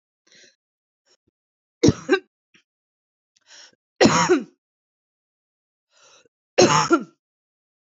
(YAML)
cough_length: 7.9 s
cough_amplitude: 27677
cough_signal_mean_std_ratio: 0.27
survey_phase: beta (2021-08-13 to 2022-03-07)
age: 45-64
gender: Female
wearing_mask: 'No'
symptom_cough_any: true
symptom_runny_or_blocked_nose: true
symptom_headache: true
symptom_other: true
symptom_onset: 2 days
smoker_status: Ex-smoker
respiratory_condition_asthma: false
respiratory_condition_other: false
recruitment_source: Test and Trace
submission_delay: 2 days
covid_test_result: Positive
covid_test_method: RT-qPCR
covid_ct_value: 24.1
covid_ct_gene: ORF1ab gene
covid_ct_mean: 24.5
covid_viral_load: 9500 copies/ml
covid_viral_load_category: Minimal viral load (< 10K copies/ml)